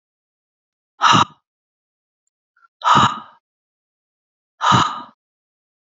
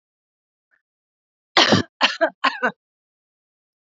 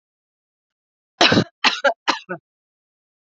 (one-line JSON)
{"exhalation_length": "5.9 s", "exhalation_amplitude": 30250, "exhalation_signal_mean_std_ratio": 0.3, "three_cough_length": "3.9 s", "three_cough_amplitude": 30006, "three_cough_signal_mean_std_ratio": 0.29, "cough_length": "3.2 s", "cough_amplitude": 32768, "cough_signal_mean_std_ratio": 0.31, "survey_phase": "alpha (2021-03-01 to 2021-08-12)", "age": "45-64", "gender": "Female", "wearing_mask": "No", "symptom_none": true, "smoker_status": "Never smoked", "respiratory_condition_asthma": false, "respiratory_condition_other": false, "recruitment_source": "REACT", "submission_delay": "2 days", "covid_test_result": "Negative", "covid_test_method": "RT-qPCR"}